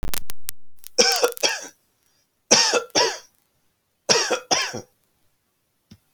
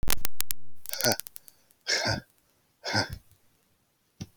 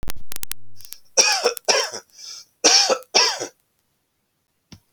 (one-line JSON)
{"three_cough_length": "6.1 s", "three_cough_amplitude": 32767, "three_cough_signal_mean_std_ratio": 0.52, "exhalation_length": "4.4 s", "exhalation_amplitude": 27430, "exhalation_signal_mean_std_ratio": 0.57, "cough_length": "4.9 s", "cough_amplitude": 32767, "cough_signal_mean_std_ratio": 0.55, "survey_phase": "beta (2021-08-13 to 2022-03-07)", "age": "45-64", "gender": "Male", "wearing_mask": "No", "symptom_none": true, "smoker_status": "Never smoked", "respiratory_condition_asthma": false, "respiratory_condition_other": false, "recruitment_source": "REACT", "submission_delay": "1 day", "covid_test_result": "Negative", "covid_test_method": "RT-qPCR"}